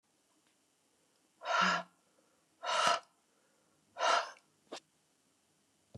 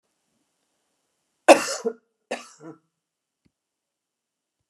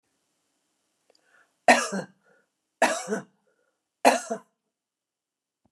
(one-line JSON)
{"exhalation_length": "6.0 s", "exhalation_amplitude": 8198, "exhalation_signal_mean_std_ratio": 0.34, "cough_length": "4.7 s", "cough_amplitude": 29204, "cough_signal_mean_std_ratio": 0.16, "three_cough_length": "5.7 s", "three_cough_amplitude": 23222, "three_cough_signal_mean_std_ratio": 0.25, "survey_phase": "beta (2021-08-13 to 2022-03-07)", "age": "65+", "gender": "Female", "wearing_mask": "No", "symptom_none": true, "smoker_status": "Never smoked", "respiratory_condition_asthma": false, "respiratory_condition_other": false, "recruitment_source": "REACT", "submission_delay": "1 day", "covid_test_result": "Negative", "covid_test_method": "RT-qPCR"}